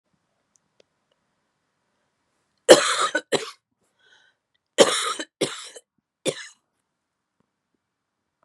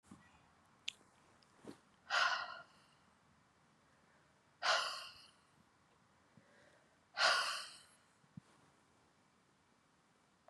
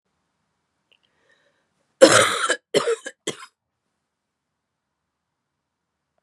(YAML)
three_cough_length: 8.4 s
three_cough_amplitude: 32768
three_cough_signal_mean_std_ratio: 0.22
exhalation_length: 10.5 s
exhalation_amplitude: 3483
exhalation_signal_mean_std_ratio: 0.3
cough_length: 6.2 s
cough_amplitude: 32768
cough_signal_mean_std_ratio: 0.24
survey_phase: beta (2021-08-13 to 2022-03-07)
age: 45-64
gender: Female
wearing_mask: 'No'
symptom_cough_any: true
symptom_runny_or_blocked_nose: true
symptom_shortness_of_breath: true
symptom_headache: true
symptom_onset: 3 days
smoker_status: Never smoked
respiratory_condition_asthma: false
respiratory_condition_other: false
recruitment_source: Test and Trace
submission_delay: 1 day
covid_test_result: Positive
covid_test_method: RT-qPCR
covid_ct_value: 19.4
covid_ct_gene: ORF1ab gene
covid_ct_mean: 19.7
covid_viral_load: 340000 copies/ml
covid_viral_load_category: Low viral load (10K-1M copies/ml)